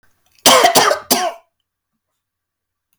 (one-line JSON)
{"cough_length": "3.0 s", "cough_amplitude": 32768, "cough_signal_mean_std_ratio": 0.39, "survey_phase": "beta (2021-08-13 to 2022-03-07)", "age": "45-64", "gender": "Male", "wearing_mask": "No", "symptom_none": true, "smoker_status": "Never smoked", "respiratory_condition_asthma": false, "respiratory_condition_other": false, "recruitment_source": "REACT", "submission_delay": "0 days", "covid_test_result": "Negative", "covid_test_method": "RT-qPCR", "influenza_a_test_result": "Unknown/Void", "influenza_b_test_result": "Unknown/Void"}